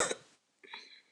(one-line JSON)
{"cough_length": "1.1 s", "cough_amplitude": 5001, "cough_signal_mean_std_ratio": 0.35, "survey_phase": "beta (2021-08-13 to 2022-03-07)", "age": "65+", "gender": "Female", "wearing_mask": "No", "symptom_none": true, "symptom_onset": "12 days", "smoker_status": "Never smoked", "respiratory_condition_asthma": false, "respiratory_condition_other": false, "recruitment_source": "REACT", "submission_delay": "2 days", "covid_test_result": "Negative", "covid_test_method": "RT-qPCR", "influenza_a_test_result": "Negative", "influenza_b_test_result": "Negative"}